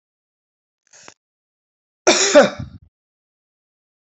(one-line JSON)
{"cough_length": "4.2 s", "cough_amplitude": 29784, "cough_signal_mean_std_ratio": 0.24, "survey_phase": "alpha (2021-03-01 to 2021-08-12)", "age": "45-64", "gender": "Female", "wearing_mask": "No", "symptom_none": true, "smoker_status": "Ex-smoker", "respiratory_condition_asthma": false, "respiratory_condition_other": false, "recruitment_source": "REACT", "submission_delay": "5 days", "covid_test_result": "Negative", "covid_test_method": "RT-qPCR"}